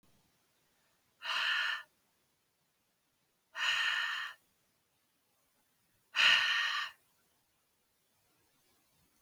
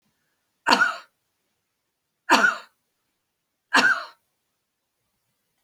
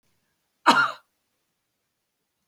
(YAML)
exhalation_length: 9.2 s
exhalation_amplitude: 7549
exhalation_signal_mean_std_ratio: 0.37
three_cough_length: 5.6 s
three_cough_amplitude: 29418
three_cough_signal_mean_std_ratio: 0.29
cough_length: 2.5 s
cough_amplitude: 21734
cough_signal_mean_std_ratio: 0.24
survey_phase: beta (2021-08-13 to 2022-03-07)
age: 65+
gender: Male
wearing_mask: 'No'
symptom_none: true
smoker_status: Ex-smoker
respiratory_condition_asthma: false
respiratory_condition_other: false
recruitment_source: REACT
submission_delay: 1 day
covid_test_result: Negative
covid_test_method: RT-qPCR